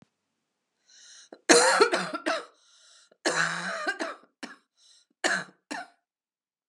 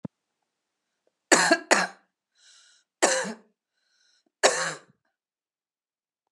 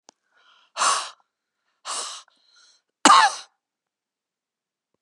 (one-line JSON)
{"cough_length": "6.7 s", "cough_amplitude": 25364, "cough_signal_mean_std_ratio": 0.37, "three_cough_length": "6.3 s", "three_cough_amplitude": 27231, "three_cough_signal_mean_std_ratio": 0.28, "exhalation_length": "5.0 s", "exhalation_amplitude": 31768, "exhalation_signal_mean_std_ratio": 0.26, "survey_phase": "beta (2021-08-13 to 2022-03-07)", "age": "45-64", "gender": "Female", "wearing_mask": "No", "symptom_cough_any": true, "symptom_onset": "12 days", "smoker_status": "Never smoked", "respiratory_condition_asthma": false, "respiratory_condition_other": false, "recruitment_source": "REACT", "submission_delay": "2 days", "covid_test_result": "Negative", "covid_test_method": "RT-qPCR", "influenza_a_test_result": "Negative", "influenza_b_test_result": "Negative"}